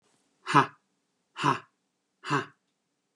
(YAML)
exhalation_length: 3.2 s
exhalation_amplitude: 16864
exhalation_signal_mean_std_ratio: 0.28
survey_phase: beta (2021-08-13 to 2022-03-07)
age: 45-64
gender: Male
wearing_mask: 'No'
symptom_none: true
smoker_status: Never smoked
respiratory_condition_asthma: false
respiratory_condition_other: false
recruitment_source: REACT
submission_delay: 2 days
covid_test_result: Negative
covid_test_method: RT-qPCR
influenza_a_test_result: Negative
influenza_b_test_result: Negative